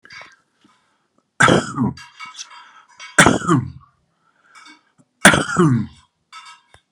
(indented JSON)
{
  "three_cough_length": "6.9 s",
  "three_cough_amplitude": 32768,
  "three_cough_signal_mean_std_ratio": 0.35,
  "survey_phase": "beta (2021-08-13 to 2022-03-07)",
  "age": "65+",
  "gender": "Male",
  "wearing_mask": "No",
  "symptom_none": true,
  "smoker_status": "Never smoked",
  "respiratory_condition_asthma": false,
  "respiratory_condition_other": false,
  "recruitment_source": "REACT",
  "submission_delay": "2 days",
  "covid_test_result": "Negative",
  "covid_test_method": "RT-qPCR"
}